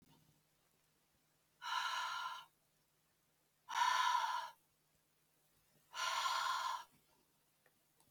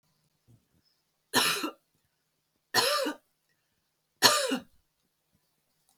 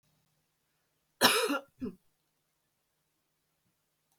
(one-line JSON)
{"exhalation_length": "8.1 s", "exhalation_amplitude": 2232, "exhalation_signal_mean_std_ratio": 0.46, "three_cough_length": "6.0 s", "three_cough_amplitude": 26930, "three_cough_signal_mean_std_ratio": 0.32, "cough_length": "4.2 s", "cough_amplitude": 14357, "cough_signal_mean_std_ratio": 0.24, "survey_phase": "beta (2021-08-13 to 2022-03-07)", "age": "45-64", "gender": "Female", "wearing_mask": "No", "symptom_none": true, "smoker_status": "Never smoked", "respiratory_condition_asthma": false, "respiratory_condition_other": false, "recruitment_source": "REACT", "submission_delay": "2 days", "covid_test_result": "Negative", "covid_test_method": "RT-qPCR"}